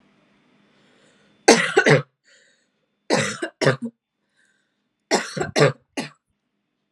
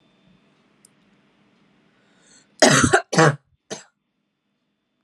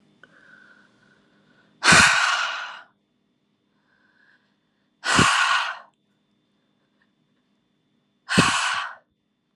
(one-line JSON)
{"three_cough_length": "6.9 s", "three_cough_amplitude": 32767, "three_cough_signal_mean_std_ratio": 0.33, "cough_length": "5.0 s", "cough_amplitude": 30965, "cough_signal_mean_std_ratio": 0.27, "exhalation_length": "9.6 s", "exhalation_amplitude": 27853, "exhalation_signal_mean_std_ratio": 0.35, "survey_phase": "alpha (2021-03-01 to 2021-08-12)", "age": "18-44", "gender": "Female", "wearing_mask": "No", "symptom_headache": true, "smoker_status": "Never smoked", "respiratory_condition_asthma": false, "respiratory_condition_other": false, "recruitment_source": "Test and Trace", "submission_delay": "0 days", "covid_test_result": "Negative", "covid_test_method": "LFT"}